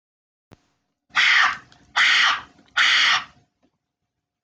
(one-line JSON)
{"exhalation_length": "4.4 s", "exhalation_amplitude": 18233, "exhalation_signal_mean_std_ratio": 0.47, "survey_phase": "beta (2021-08-13 to 2022-03-07)", "age": "45-64", "gender": "Female", "wearing_mask": "No", "symptom_none": true, "smoker_status": "Never smoked", "respiratory_condition_asthma": false, "respiratory_condition_other": false, "recruitment_source": "REACT", "submission_delay": "2 days", "covid_test_result": "Negative", "covid_test_method": "RT-qPCR"}